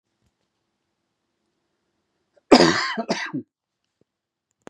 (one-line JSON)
{"cough_length": "4.7 s", "cough_amplitude": 32767, "cough_signal_mean_std_ratio": 0.24, "survey_phase": "beta (2021-08-13 to 2022-03-07)", "age": "45-64", "gender": "Male", "wearing_mask": "No", "symptom_cough_any": true, "symptom_runny_or_blocked_nose": true, "symptom_onset": "12 days", "smoker_status": "Never smoked", "respiratory_condition_asthma": false, "respiratory_condition_other": false, "recruitment_source": "REACT", "submission_delay": "3 days", "covid_test_result": "Negative", "covid_test_method": "RT-qPCR", "influenza_a_test_result": "Negative", "influenza_b_test_result": "Negative"}